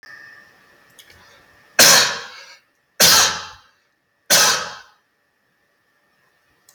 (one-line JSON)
{"three_cough_length": "6.7 s", "three_cough_amplitude": 32768, "three_cough_signal_mean_std_ratio": 0.33, "survey_phase": "beta (2021-08-13 to 2022-03-07)", "age": "65+", "gender": "Male", "wearing_mask": "No", "symptom_cough_any": true, "smoker_status": "Never smoked", "respiratory_condition_asthma": false, "respiratory_condition_other": false, "recruitment_source": "REACT", "submission_delay": "2 days", "covid_test_result": "Negative", "covid_test_method": "RT-qPCR", "influenza_a_test_result": "Negative", "influenza_b_test_result": "Negative"}